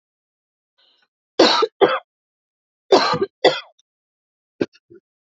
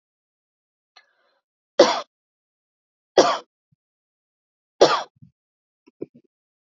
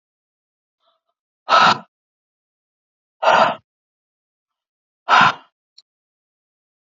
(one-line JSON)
{"cough_length": "5.3 s", "cough_amplitude": 32374, "cough_signal_mean_std_ratio": 0.31, "three_cough_length": "6.7 s", "three_cough_amplitude": 30245, "three_cough_signal_mean_std_ratio": 0.2, "exhalation_length": "6.8 s", "exhalation_amplitude": 30647, "exhalation_signal_mean_std_ratio": 0.27, "survey_phase": "alpha (2021-03-01 to 2021-08-12)", "age": "18-44", "gender": "Female", "wearing_mask": "No", "symptom_none": true, "smoker_status": "Never smoked", "respiratory_condition_asthma": false, "respiratory_condition_other": false, "recruitment_source": "REACT", "submission_delay": "2 days", "covid_test_result": "Negative", "covid_test_method": "RT-qPCR"}